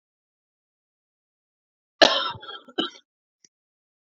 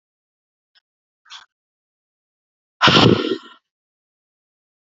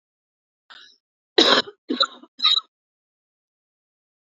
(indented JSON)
{
  "cough_length": "4.0 s",
  "cough_amplitude": 30631,
  "cough_signal_mean_std_ratio": 0.2,
  "exhalation_length": "4.9 s",
  "exhalation_amplitude": 31491,
  "exhalation_signal_mean_std_ratio": 0.24,
  "three_cough_length": "4.3 s",
  "three_cough_amplitude": 28074,
  "three_cough_signal_mean_std_ratio": 0.28,
  "survey_phase": "beta (2021-08-13 to 2022-03-07)",
  "age": "18-44",
  "gender": "Female",
  "wearing_mask": "No",
  "symptom_cough_any": true,
  "symptom_runny_or_blocked_nose": true,
  "symptom_shortness_of_breath": true,
  "symptom_sore_throat": true,
  "symptom_diarrhoea": true,
  "symptom_fatigue": true,
  "symptom_headache": true,
  "symptom_onset": "3 days",
  "smoker_status": "Ex-smoker",
  "respiratory_condition_asthma": false,
  "respiratory_condition_other": false,
  "recruitment_source": "Test and Trace",
  "submission_delay": "2 days",
  "covid_test_result": "Positive",
  "covid_test_method": "RT-qPCR",
  "covid_ct_value": 22.5,
  "covid_ct_gene": "N gene",
  "covid_ct_mean": 22.8,
  "covid_viral_load": "34000 copies/ml",
  "covid_viral_load_category": "Low viral load (10K-1M copies/ml)"
}